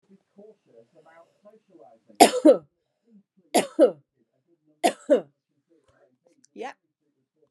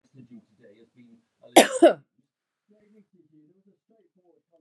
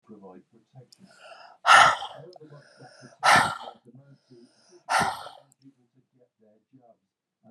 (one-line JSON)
{"three_cough_length": "7.5 s", "three_cough_amplitude": 32767, "three_cough_signal_mean_std_ratio": 0.23, "cough_length": "4.6 s", "cough_amplitude": 32208, "cough_signal_mean_std_ratio": 0.18, "exhalation_length": "7.5 s", "exhalation_amplitude": 23500, "exhalation_signal_mean_std_ratio": 0.28, "survey_phase": "beta (2021-08-13 to 2022-03-07)", "age": "45-64", "gender": "Female", "wearing_mask": "No", "symptom_none": true, "smoker_status": "Never smoked", "respiratory_condition_asthma": false, "respiratory_condition_other": false, "recruitment_source": "REACT", "submission_delay": "1 day", "covid_test_result": "Negative", "covid_test_method": "RT-qPCR", "influenza_a_test_result": "Negative", "influenza_b_test_result": "Negative"}